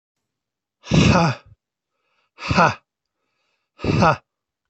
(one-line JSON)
{"exhalation_length": "4.7 s", "exhalation_amplitude": 24665, "exhalation_signal_mean_std_ratio": 0.37, "survey_phase": "alpha (2021-03-01 to 2021-08-12)", "age": "65+", "gender": "Male", "wearing_mask": "Yes", "symptom_none": true, "symptom_onset": "12 days", "smoker_status": "Ex-smoker", "respiratory_condition_asthma": false, "respiratory_condition_other": true, "recruitment_source": "REACT", "submission_delay": "1 day", "covid_test_result": "Negative", "covid_test_method": "RT-qPCR"}